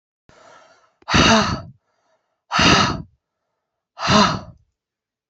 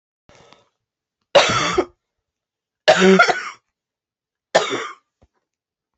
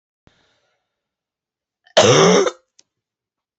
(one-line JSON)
{"exhalation_length": "5.3 s", "exhalation_amplitude": 27183, "exhalation_signal_mean_std_ratio": 0.41, "three_cough_length": "6.0 s", "three_cough_amplitude": 28759, "three_cough_signal_mean_std_ratio": 0.34, "cough_length": "3.6 s", "cough_amplitude": 28706, "cough_signal_mean_std_ratio": 0.32, "survey_phase": "beta (2021-08-13 to 2022-03-07)", "age": "18-44", "gender": "Female", "wearing_mask": "No", "symptom_cough_any": true, "symptom_runny_or_blocked_nose": true, "symptom_shortness_of_breath": true, "symptom_sore_throat": true, "symptom_fatigue": true, "symptom_headache": true, "symptom_change_to_sense_of_smell_or_taste": true, "symptom_loss_of_taste": true, "symptom_onset": "3 days", "smoker_status": "Never smoked", "respiratory_condition_asthma": false, "respiratory_condition_other": false, "recruitment_source": "Test and Trace", "submission_delay": "1 day", "covid_test_result": "Positive", "covid_test_method": "RT-qPCR", "covid_ct_value": 18.9, "covid_ct_gene": "ORF1ab gene", "covid_ct_mean": 20.2, "covid_viral_load": "230000 copies/ml", "covid_viral_load_category": "Low viral load (10K-1M copies/ml)"}